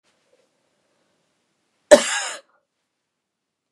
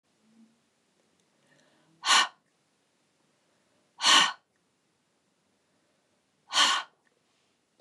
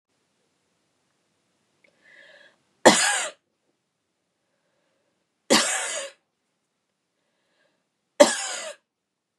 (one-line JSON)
{"cough_length": "3.7 s", "cough_amplitude": 32768, "cough_signal_mean_std_ratio": 0.17, "exhalation_length": "7.8 s", "exhalation_amplitude": 17549, "exhalation_signal_mean_std_ratio": 0.25, "three_cough_length": "9.4 s", "three_cough_amplitude": 32768, "three_cough_signal_mean_std_ratio": 0.23, "survey_phase": "beta (2021-08-13 to 2022-03-07)", "age": "65+", "gender": "Female", "wearing_mask": "No", "symptom_fatigue": true, "smoker_status": "Never smoked", "respiratory_condition_asthma": false, "respiratory_condition_other": false, "recruitment_source": "Test and Trace", "submission_delay": "0 days", "covid_test_result": "Negative", "covid_test_method": "LFT"}